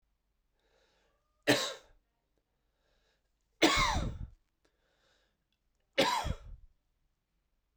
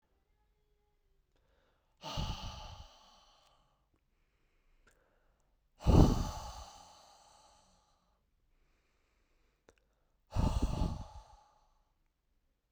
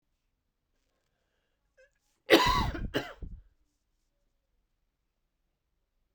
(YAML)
three_cough_length: 7.8 s
three_cough_amplitude: 9226
three_cough_signal_mean_std_ratio: 0.3
exhalation_length: 12.7 s
exhalation_amplitude: 10792
exhalation_signal_mean_std_ratio: 0.25
cough_length: 6.1 s
cough_amplitude: 19333
cough_signal_mean_std_ratio: 0.24
survey_phase: beta (2021-08-13 to 2022-03-07)
age: 18-44
gender: Male
wearing_mask: 'No'
symptom_cough_any: true
symptom_fatigue: true
symptom_onset: 3 days
smoker_status: Never smoked
respiratory_condition_asthma: false
respiratory_condition_other: false
recruitment_source: Test and Trace
submission_delay: 2 days
covid_test_result: Positive
covid_test_method: RT-qPCR
covid_ct_value: 20.2
covid_ct_gene: ORF1ab gene
covid_ct_mean: 20.6
covid_viral_load: 180000 copies/ml
covid_viral_load_category: Low viral load (10K-1M copies/ml)